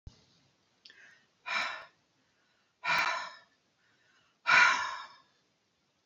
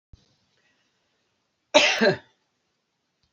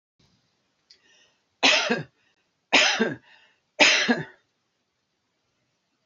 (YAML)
exhalation_length: 6.1 s
exhalation_amplitude: 10018
exhalation_signal_mean_std_ratio: 0.33
cough_length: 3.3 s
cough_amplitude: 27443
cough_signal_mean_std_ratio: 0.26
three_cough_length: 6.1 s
three_cough_amplitude: 24652
three_cough_signal_mean_std_ratio: 0.34
survey_phase: beta (2021-08-13 to 2022-03-07)
age: 45-64
gender: Female
wearing_mask: 'No'
symptom_shortness_of_breath: true
symptom_onset: 8 days
smoker_status: Never smoked
respiratory_condition_asthma: false
respiratory_condition_other: false
recruitment_source: REACT
submission_delay: 2 days
covid_test_result: Negative
covid_test_method: RT-qPCR
influenza_a_test_result: Negative
influenza_b_test_result: Negative